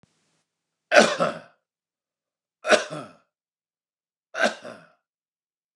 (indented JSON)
{
  "three_cough_length": "5.8 s",
  "three_cough_amplitude": 29203,
  "three_cough_signal_mean_std_ratio": 0.26,
  "survey_phase": "beta (2021-08-13 to 2022-03-07)",
  "age": "45-64",
  "gender": "Male",
  "wearing_mask": "No",
  "symptom_none": true,
  "smoker_status": "Ex-smoker",
  "respiratory_condition_asthma": false,
  "respiratory_condition_other": false,
  "recruitment_source": "REACT",
  "submission_delay": "0 days",
  "covid_test_result": "Negative",
  "covid_test_method": "RT-qPCR",
  "influenza_a_test_result": "Negative",
  "influenza_b_test_result": "Negative"
}